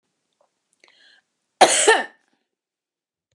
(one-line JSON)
{"cough_length": "3.3 s", "cough_amplitude": 32767, "cough_signal_mean_std_ratio": 0.26, "survey_phase": "beta (2021-08-13 to 2022-03-07)", "age": "65+", "gender": "Female", "wearing_mask": "No", "symptom_none": true, "smoker_status": "Ex-smoker", "respiratory_condition_asthma": false, "respiratory_condition_other": false, "recruitment_source": "REACT", "submission_delay": "1 day", "covid_test_result": "Negative", "covid_test_method": "RT-qPCR"}